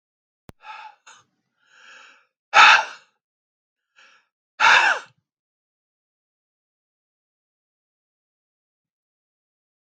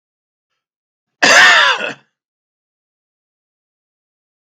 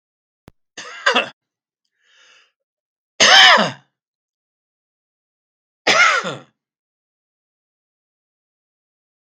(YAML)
exhalation_length: 10.0 s
exhalation_amplitude: 32768
exhalation_signal_mean_std_ratio: 0.2
cough_length: 4.5 s
cough_amplitude: 32768
cough_signal_mean_std_ratio: 0.31
three_cough_length: 9.2 s
three_cough_amplitude: 32768
three_cough_signal_mean_std_ratio: 0.27
survey_phase: beta (2021-08-13 to 2022-03-07)
age: 65+
gender: Male
wearing_mask: 'No'
symptom_none: true
smoker_status: Never smoked
respiratory_condition_asthma: false
respiratory_condition_other: false
recruitment_source: REACT
submission_delay: 2 days
covid_test_result: Negative
covid_test_method: RT-qPCR
influenza_a_test_result: Negative
influenza_b_test_result: Negative